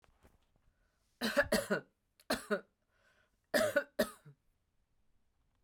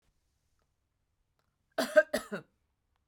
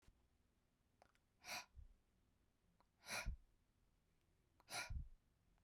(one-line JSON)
{"three_cough_length": "5.6 s", "three_cough_amplitude": 4803, "three_cough_signal_mean_std_ratio": 0.33, "cough_length": "3.1 s", "cough_amplitude": 11777, "cough_signal_mean_std_ratio": 0.21, "exhalation_length": "5.6 s", "exhalation_amplitude": 535, "exhalation_signal_mean_std_ratio": 0.37, "survey_phase": "beta (2021-08-13 to 2022-03-07)", "age": "45-64", "gender": "Female", "wearing_mask": "No", "symptom_sore_throat": true, "smoker_status": "Never smoked", "respiratory_condition_asthma": false, "respiratory_condition_other": true, "recruitment_source": "Test and Trace", "submission_delay": "0 days", "covid_test_result": "Negative", "covid_test_method": "LFT"}